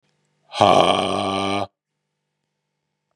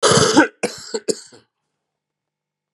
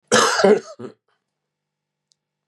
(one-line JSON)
{"exhalation_length": "3.2 s", "exhalation_amplitude": 31813, "exhalation_signal_mean_std_ratio": 0.41, "three_cough_length": "2.7 s", "three_cough_amplitude": 32450, "three_cough_signal_mean_std_ratio": 0.38, "cough_length": "2.5 s", "cough_amplitude": 29408, "cough_signal_mean_std_ratio": 0.36, "survey_phase": "beta (2021-08-13 to 2022-03-07)", "age": "45-64", "gender": "Male", "wearing_mask": "No", "symptom_cough_any": true, "symptom_new_continuous_cough": true, "symptom_shortness_of_breath": true, "symptom_sore_throat": true, "symptom_fatigue": true, "symptom_fever_high_temperature": true, "symptom_headache": true, "symptom_loss_of_taste": true, "symptom_onset": "3 days", "smoker_status": "Never smoked", "respiratory_condition_asthma": false, "respiratory_condition_other": false, "recruitment_source": "Test and Trace", "submission_delay": "1 day", "covid_test_result": "Positive", "covid_test_method": "RT-qPCR", "covid_ct_value": 14.5, "covid_ct_gene": "N gene"}